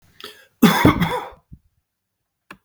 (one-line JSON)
{"cough_length": "2.6 s", "cough_amplitude": 32768, "cough_signal_mean_std_ratio": 0.35, "survey_phase": "beta (2021-08-13 to 2022-03-07)", "age": "45-64", "gender": "Male", "wearing_mask": "No", "symptom_none": true, "symptom_onset": "9 days", "smoker_status": "Never smoked", "respiratory_condition_asthma": false, "respiratory_condition_other": false, "recruitment_source": "REACT", "submission_delay": "3 days", "covid_test_result": "Negative", "covid_test_method": "RT-qPCR", "influenza_a_test_result": "Negative", "influenza_b_test_result": "Negative"}